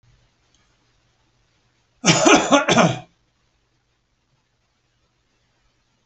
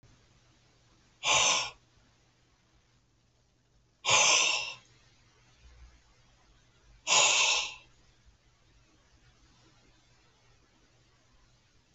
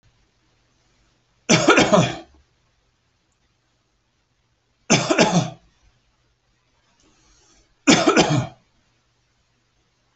{
  "cough_length": "6.1 s",
  "cough_amplitude": 29506,
  "cough_signal_mean_std_ratio": 0.29,
  "exhalation_length": "11.9 s",
  "exhalation_amplitude": 10055,
  "exhalation_signal_mean_std_ratio": 0.32,
  "three_cough_length": "10.2 s",
  "three_cough_amplitude": 30612,
  "three_cough_signal_mean_std_ratio": 0.32,
  "survey_phase": "beta (2021-08-13 to 2022-03-07)",
  "age": "65+",
  "gender": "Male",
  "wearing_mask": "No",
  "symptom_none": true,
  "smoker_status": "Never smoked",
  "respiratory_condition_asthma": false,
  "respiratory_condition_other": false,
  "recruitment_source": "REACT",
  "submission_delay": "0 days",
  "covid_test_result": "Negative",
  "covid_test_method": "RT-qPCR"
}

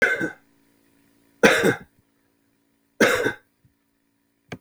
{
  "three_cough_length": "4.6 s",
  "three_cough_amplitude": 32766,
  "three_cough_signal_mean_std_ratio": 0.34,
  "survey_phase": "beta (2021-08-13 to 2022-03-07)",
  "age": "45-64",
  "gender": "Male",
  "wearing_mask": "No",
  "symptom_none": true,
  "smoker_status": "Ex-smoker",
  "respiratory_condition_asthma": false,
  "respiratory_condition_other": false,
  "recruitment_source": "REACT",
  "submission_delay": "2 days",
  "covid_test_result": "Negative",
  "covid_test_method": "RT-qPCR",
  "influenza_a_test_result": "Negative",
  "influenza_b_test_result": "Negative"
}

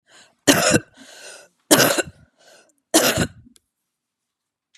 {
  "three_cough_length": "4.8 s",
  "three_cough_amplitude": 32767,
  "three_cough_signal_mean_std_ratio": 0.35,
  "survey_phase": "beta (2021-08-13 to 2022-03-07)",
  "age": "45-64",
  "gender": "Female",
  "wearing_mask": "No",
  "symptom_none": true,
  "smoker_status": "Current smoker (1 to 10 cigarettes per day)",
  "respiratory_condition_asthma": false,
  "respiratory_condition_other": false,
  "recruitment_source": "REACT",
  "submission_delay": "2 days",
  "covid_test_result": "Negative",
  "covid_test_method": "RT-qPCR",
  "influenza_a_test_result": "Negative",
  "influenza_b_test_result": "Negative"
}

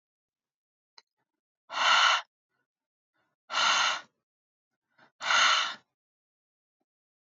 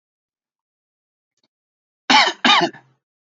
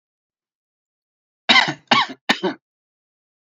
{
  "exhalation_length": "7.3 s",
  "exhalation_amplitude": 10293,
  "exhalation_signal_mean_std_ratio": 0.36,
  "cough_length": "3.3 s",
  "cough_amplitude": 31940,
  "cough_signal_mean_std_ratio": 0.29,
  "three_cough_length": "3.4 s",
  "three_cough_amplitude": 29486,
  "three_cough_signal_mean_std_ratio": 0.29,
  "survey_phase": "beta (2021-08-13 to 2022-03-07)",
  "age": "18-44",
  "gender": "Male",
  "wearing_mask": "No",
  "symptom_none": true,
  "smoker_status": "Never smoked",
  "respiratory_condition_asthma": false,
  "respiratory_condition_other": false,
  "recruitment_source": "REACT",
  "submission_delay": "2 days",
  "covid_test_result": "Negative",
  "covid_test_method": "RT-qPCR",
  "influenza_a_test_result": "Negative",
  "influenza_b_test_result": "Negative"
}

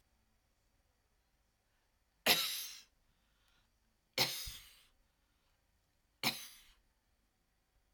{
  "three_cough_length": "7.9 s",
  "three_cough_amplitude": 8652,
  "three_cough_signal_mean_std_ratio": 0.25,
  "survey_phase": "alpha (2021-03-01 to 2021-08-12)",
  "age": "65+",
  "gender": "Female",
  "wearing_mask": "No",
  "symptom_none": true,
  "smoker_status": "Never smoked",
  "respiratory_condition_asthma": false,
  "respiratory_condition_other": false,
  "recruitment_source": "REACT",
  "submission_delay": "2 days",
  "covid_test_result": "Negative",
  "covid_test_method": "RT-qPCR"
}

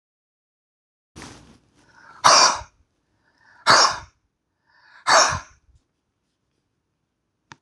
{
  "exhalation_length": "7.6 s",
  "exhalation_amplitude": 26028,
  "exhalation_signal_mean_std_ratio": 0.28,
  "survey_phase": "alpha (2021-03-01 to 2021-08-12)",
  "age": "45-64",
  "gender": "Male",
  "wearing_mask": "No",
  "symptom_cough_any": true,
  "symptom_fatigue": true,
  "symptom_headache": true,
  "smoker_status": "Never smoked",
  "respiratory_condition_asthma": false,
  "respiratory_condition_other": true,
  "recruitment_source": "Test and Trace",
  "submission_delay": "2 days",
  "covid_test_result": "Positive",
  "covid_test_method": "LFT"
}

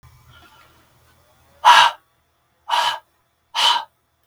{
  "exhalation_length": "4.3 s",
  "exhalation_amplitude": 32768,
  "exhalation_signal_mean_std_ratio": 0.33,
  "survey_phase": "beta (2021-08-13 to 2022-03-07)",
  "age": "65+",
  "gender": "Male",
  "wearing_mask": "No",
  "symptom_runny_or_blocked_nose": true,
  "symptom_onset": "4 days",
  "smoker_status": "Never smoked",
  "respiratory_condition_asthma": false,
  "respiratory_condition_other": false,
  "recruitment_source": "REACT",
  "submission_delay": "1 day",
  "covid_test_result": "Negative",
  "covid_test_method": "RT-qPCR",
  "influenza_a_test_result": "Unknown/Void",
  "influenza_b_test_result": "Unknown/Void"
}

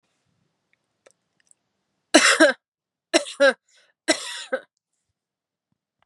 {
  "three_cough_length": "6.1 s",
  "three_cough_amplitude": 32310,
  "three_cough_signal_mean_std_ratio": 0.27,
  "survey_phase": "beta (2021-08-13 to 2022-03-07)",
  "age": "18-44",
  "gender": "Female",
  "wearing_mask": "No",
  "symptom_cough_any": true,
  "symptom_runny_or_blocked_nose": true,
  "symptom_abdominal_pain": true,
  "symptom_fatigue": true,
  "symptom_headache": true,
  "symptom_change_to_sense_of_smell_or_taste": true,
  "symptom_onset": "6 days",
  "smoker_status": "Never smoked",
  "respiratory_condition_asthma": true,
  "respiratory_condition_other": false,
  "recruitment_source": "REACT",
  "submission_delay": "2 days",
  "covid_test_result": "Positive",
  "covid_test_method": "RT-qPCR",
  "covid_ct_value": 23.0,
  "covid_ct_gene": "E gene"
}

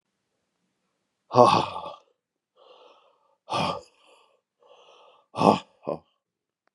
{
  "exhalation_length": "6.7 s",
  "exhalation_amplitude": 29096,
  "exhalation_signal_mean_std_ratio": 0.25,
  "survey_phase": "beta (2021-08-13 to 2022-03-07)",
  "age": "45-64",
  "gender": "Male",
  "wearing_mask": "No",
  "symptom_cough_any": true,
  "symptom_runny_or_blocked_nose": true,
  "symptom_onset": "2 days",
  "smoker_status": "Never smoked",
  "respiratory_condition_asthma": false,
  "respiratory_condition_other": false,
  "recruitment_source": "REACT",
  "submission_delay": "0 days",
  "covid_test_result": "Negative",
  "covid_test_method": "RT-qPCR"
}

